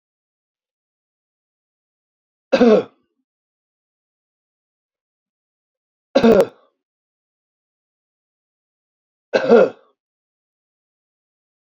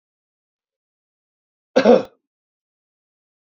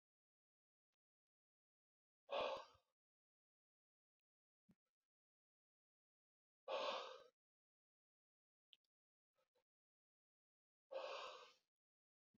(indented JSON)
{
  "three_cough_length": "11.6 s",
  "three_cough_amplitude": 27551,
  "three_cough_signal_mean_std_ratio": 0.22,
  "cough_length": "3.6 s",
  "cough_amplitude": 28538,
  "cough_signal_mean_std_ratio": 0.2,
  "exhalation_length": "12.4 s",
  "exhalation_amplitude": 720,
  "exhalation_signal_mean_std_ratio": 0.25,
  "survey_phase": "beta (2021-08-13 to 2022-03-07)",
  "age": "65+",
  "gender": "Male",
  "wearing_mask": "No",
  "symptom_none": true,
  "smoker_status": "Ex-smoker",
  "respiratory_condition_asthma": false,
  "respiratory_condition_other": false,
  "recruitment_source": "REACT",
  "submission_delay": "9 days",
  "covid_test_result": "Negative",
  "covid_test_method": "RT-qPCR",
  "influenza_a_test_result": "Negative",
  "influenza_b_test_result": "Negative"
}